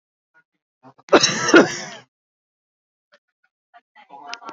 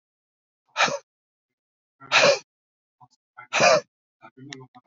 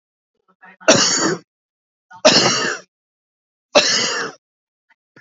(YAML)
cough_length: 4.5 s
cough_amplitude: 32768
cough_signal_mean_std_ratio: 0.26
exhalation_length: 4.9 s
exhalation_amplitude: 21292
exhalation_signal_mean_std_ratio: 0.31
three_cough_length: 5.2 s
three_cough_amplitude: 31774
three_cough_signal_mean_std_ratio: 0.42
survey_phase: beta (2021-08-13 to 2022-03-07)
age: 18-44
gender: Male
wearing_mask: 'No'
symptom_none: true
smoker_status: Never smoked
respiratory_condition_asthma: true
respiratory_condition_other: false
recruitment_source: REACT
submission_delay: 2 days
covid_test_result: Negative
covid_test_method: RT-qPCR
influenza_a_test_result: Negative
influenza_b_test_result: Negative